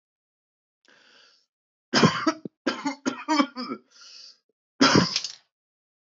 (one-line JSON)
{"three_cough_length": "6.1 s", "three_cough_amplitude": 19528, "three_cough_signal_mean_std_ratio": 0.35, "survey_phase": "beta (2021-08-13 to 2022-03-07)", "age": "18-44", "gender": "Male", "wearing_mask": "No", "symptom_cough_any": true, "symptom_runny_or_blocked_nose": true, "symptom_shortness_of_breath": true, "symptom_fatigue": true, "symptom_headache": true, "symptom_change_to_sense_of_smell_or_taste": true, "symptom_onset": "2 days", "smoker_status": "Never smoked", "respiratory_condition_asthma": false, "respiratory_condition_other": false, "recruitment_source": "Test and Trace", "submission_delay": "2 days", "covid_test_result": "Positive", "covid_test_method": "RT-qPCR", "covid_ct_value": 23.0, "covid_ct_gene": "ORF1ab gene", "covid_ct_mean": 23.4, "covid_viral_load": "22000 copies/ml", "covid_viral_load_category": "Low viral load (10K-1M copies/ml)"}